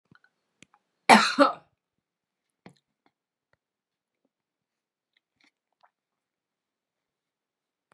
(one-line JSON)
{"cough_length": "7.9 s", "cough_amplitude": 30232, "cough_signal_mean_std_ratio": 0.15, "survey_phase": "beta (2021-08-13 to 2022-03-07)", "age": "45-64", "gender": "Female", "wearing_mask": "No", "symptom_none": true, "smoker_status": "Never smoked", "respiratory_condition_asthma": false, "respiratory_condition_other": false, "recruitment_source": "REACT", "submission_delay": "0 days", "covid_test_result": "Negative", "covid_test_method": "RT-qPCR", "influenza_a_test_result": "Negative", "influenza_b_test_result": "Negative"}